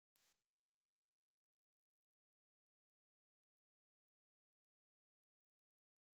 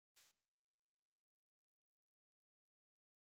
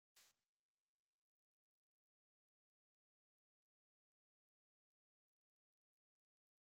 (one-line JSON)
{"exhalation_length": "6.1 s", "exhalation_amplitude": 122, "exhalation_signal_mean_std_ratio": 0.13, "cough_length": "3.3 s", "cough_amplitude": 45, "cough_signal_mean_std_ratio": 0.18, "three_cough_length": "6.7 s", "three_cough_amplitude": 48, "three_cough_signal_mean_std_ratio": 0.12, "survey_phase": "beta (2021-08-13 to 2022-03-07)", "age": "65+", "gender": "Male", "wearing_mask": "No", "symptom_change_to_sense_of_smell_or_taste": true, "smoker_status": "Ex-smoker", "respiratory_condition_asthma": false, "respiratory_condition_other": false, "recruitment_source": "REACT", "submission_delay": "12 days", "covid_test_result": "Negative", "covid_test_method": "RT-qPCR", "influenza_a_test_result": "Negative", "influenza_b_test_result": "Negative"}